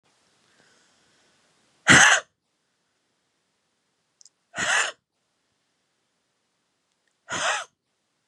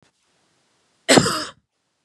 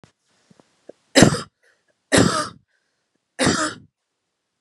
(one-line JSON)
{"exhalation_length": "8.3 s", "exhalation_amplitude": 30940, "exhalation_signal_mean_std_ratio": 0.23, "cough_length": "2.0 s", "cough_amplitude": 31397, "cough_signal_mean_std_ratio": 0.28, "three_cough_length": "4.6 s", "three_cough_amplitude": 32768, "three_cough_signal_mean_std_ratio": 0.31, "survey_phase": "beta (2021-08-13 to 2022-03-07)", "age": "18-44", "gender": "Female", "wearing_mask": "No", "symptom_none": true, "smoker_status": "Ex-smoker", "respiratory_condition_asthma": false, "respiratory_condition_other": false, "recruitment_source": "REACT", "submission_delay": "1 day", "covid_test_result": "Negative", "covid_test_method": "RT-qPCR", "influenza_a_test_result": "Negative", "influenza_b_test_result": "Negative"}